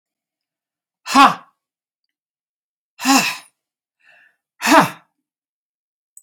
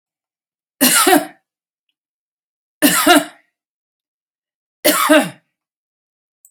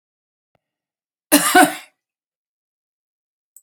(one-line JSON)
{"exhalation_length": "6.2 s", "exhalation_amplitude": 32767, "exhalation_signal_mean_std_ratio": 0.26, "three_cough_length": "6.5 s", "three_cough_amplitude": 32768, "three_cough_signal_mean_std_ratio": 0.35, "cough_length": "3.6 s", "cough_amplitude": 32768, "cough_signal_mean_std_ratio": 0.24, "survey_phase": "beta (2021-08-13 to 2022-03-07)", "age": "65+", "gender": "Female", "wearing_mask": "No", "symptom_none": true, "smoker_status": "Never smoked", "respiratory_condition_asthma": false, "respiratory_condition_other": false, "recruitment_source": "REACT", "submission_delay": "3 days", "covid_test_result": "Negative", "covid_test_method": "RT-qPCR"}